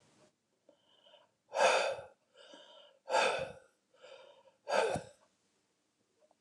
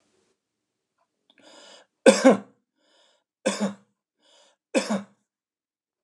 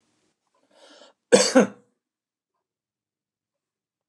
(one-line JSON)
{"exhalation_length": "6.4 s", "exhalation_amplitude": 6144, "exhalation_signal_mean_std_ratio": 0.36, "three_cough_length": "6.0 s", "three_cough_amplitude": 28772, "three_cough_signal_mean_std_ratio": 0.23, "cough_length": "4.1 s", "cough_amplitude": 28513, "cough_signal_mean_std_ratio": 0.2, "survey_phase": "beta (2021-08-13 to 2022-03-07)", "age": "45-64", "gender": "Male", "wearing_mask": "No", "symptom_none": true, "smoker_status": "Never smoked", "respiratory_condition_asthma": false, "respiratory_condition_other": false, "recruitment_source": "REACT", "submission_delay": "2 days", "covid_test_result": "Negative", "covid_test_method": "RT-qPCR"}